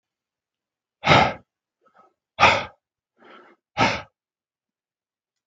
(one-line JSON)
{"exhalation_length": "5.5 s", "exhalation_amplitude": 32681, "exhalation_signal_mean_std_ratio": 0.27, "survey_phase": "beta (2021-08-13 to 2022-03-07)", "age": "65+", "gender": "Male", "wearing_mask": "No", "symptom_cough_any": true, "symptom_sore_throat": true, "symptom_onset": "3 days", "smoker_status": "Ex-smoker", "respiratory_condition_asthma": false, "respiratory_condition_other": false, "recruitment_source": "Test and Trace", "submission_delay": "2 days", "covid_test_result": "Positive", "covid_test_method": "RT-qPCR", "covid_ct_value": 23.1, "covid_ct_gene": "ORF1ab gene"}